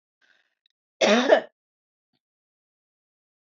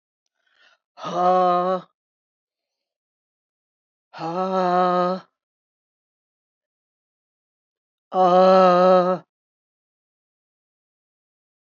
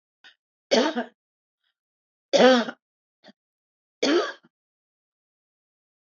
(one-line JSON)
{"cough_length": "3.4 s", "cough_amplitude": 19925, "cough_signal_mean_std_ratio": 0.26, "exhalation_length": "11.6 s", "exhalation_amplitude": 21666, "exhalation_signal_mean_std_ratio": 0.37, "three_cough_length": "6.1 s", "three_cough_amplitude": 22417, "three_cough_signal_mean_std_ratio": 0.29, "survey_phase": "beta (2021-08-13 to 2022-03-07)", "age": "65+", "gender": "Female", "wearing_mask": "No", "symptom_none": true, "smoker_status": "Never smoked", "respiratory_condition_asthma": false, "respiratory_condition_other": false, "recruitment_source": "REACT", "submission_delay": "1 day", "covid_test_result": "Negative", "covid_test_method": "RT-qPCR"}